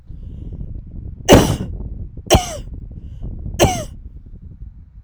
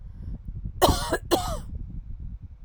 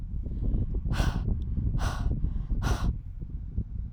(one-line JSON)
{"three_cough_length": "5.0 s", "three_cough_amplitude": 32768, "three_cough_signal_mean_std_ratio": 0.45, "cough_length": "2.6 s", "cough_amplitude": 22458, "cough_signal_mean_std_ratio": 0.62, "exhalation_length": "3.9 s", "exhalation_amplitude": 8370, "exhalation_signal_mean_std_ratio": 1.04, "survey_phase": "alpha (2021-03-01 to 2021-08-12)", "age": "45-64", "gender": "Female", "wearing_mask": "No", "symptom_cough_any": true, "symptom_new_continuous_cough": true, "symptom_headache": true, "symptom_change_to_sense_of_smell_or_taste": true, "symptom_loss_of_taste": true, "symptom_onset": "4 days", "smoker_status": "Never smoked", "respiratory_condition_asthma": false, "respiratory_condition_other": false, "recruitment_source": "Test and Trace", "submission_delay": "2 days", "covid_test_result": "Positive", "covid_test_method": "RT-qPCR", "covid_ct_value": 14.5, "covid_ct_gene": "N gene", "covid_ct_mean": 14.9, "covid_viral_load": "13000000 copies/ml", "covid_viral_load_category": "High viral load (>1M copies/ml)"}